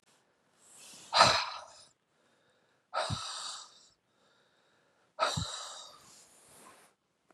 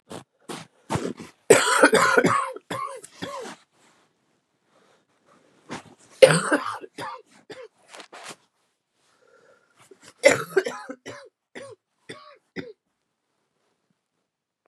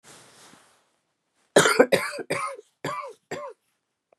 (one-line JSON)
{"exhalation_length": "7.3 s", "exhalation_amplitude": 13975, "exhalation_signal_mean_std_ratio": 0.31, "three_cough_length": "14.7 s", "three_cough_amplitude": 32768, "three_cough_signal_mean_std_ratio": 0.29, "cough_length": "4.2 s", "cough_amplitude": 25526, "cough_signal_mean_std_ratio": 0.32, "survey_phase": "beta (2021-08-13 to 2022-03-07)", "age": "45-64", "gender": "Female", "wearing_mask": "No", "symptom_new_continuous_cough": true, "symptom_runny_or_blocked_nose": true, "symptom_shortness_of_breath": true, "symptom_sore_throat": true, "symptom_diarrhoea": true, "symptom_fatigue": true, "symptom_fever_high_temperature": true, "symptom_headache": true, "symptom_change_to_sense_of_smell_or_taste": true, "smoker_status": "Never smoked", "respiratory_condition_asthma": false, "respiratory_condition_other": false, "recruitment_source": "Test and Trace", "submission_delay": "2 days", "covid_test_result": "Positive", "covid_test_method": "LFT"}